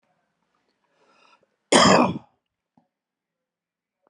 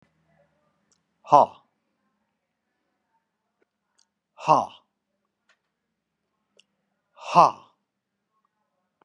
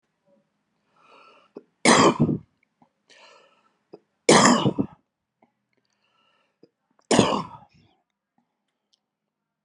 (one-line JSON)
{"cough_length": "4.1 s", "cough_amplitude": 30290, "cough_signal_mean_std_ratio": 0.25, "exhalation_length": "9.0 s", "exhalation_amplitude": 29368, "exhalation_signal_mean_std_ratio": 0.16, "three_cough_length": "9.6 s", "three_cough_amplitude": 32691, "three_cough_signal_mean_std_ratio": 0.28, "survey_phase": "beta (2021-08-13 to 2022-03-07)", "age": "45-64", "gender": "Male", "wearing_mask": "No", "symptom_none": true, "smoker_status": "Never smoked", "respiratory_condition_asthma": false, "respiratory_condition_other": false, "recruitment_source": "Test and Trace", "submission_delay": "0 days", "covid_test_result": "Negative", "covid_test_method": "LFT"}